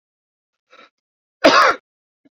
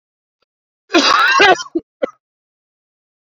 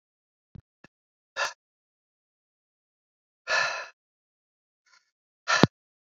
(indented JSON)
{
  "cough_length": "2.4 s",
  "cough_amplitude": 29030,
  "cough_signal_mean_std_ratio": 0.29,
  "three_cough_length": "3.3 s",
  "three_cough_amplitude": 28545,
  "three_cough_signal_mean_std_ratio": 0.39,
  "exhalation_length": "6.1 s",
  "exhalation_amplitude": 28045,
  "exhalation_signal_mean_std_ratio": 0.21,
  "survey_phase": "beta (2021-08-13 to 2022-03-07)",
  "age": "18-44",
  "gender": "Male",
  "wearing_mask": "No",
  "symptom_runny_or_blocked_nose": true,
  "symptom_fatigue": true,
  "symptom_fever_high_temperature": true,
  "symptom_headache": true,
  "symptom_change_to_sense_of_smell_or_taste": true,
  "symptom_onset": "2 days",
  "smoker_status": "Never smoked",
  "respiratory_condition_asthma": false,
  "respiratory_condition_other": false,
  "recruitment_source": "Test and Trace",
  "submission_delay": "1 day",
  "covid_test_result": "Negative",
  "covid_test_method": "RT-qPCR"
}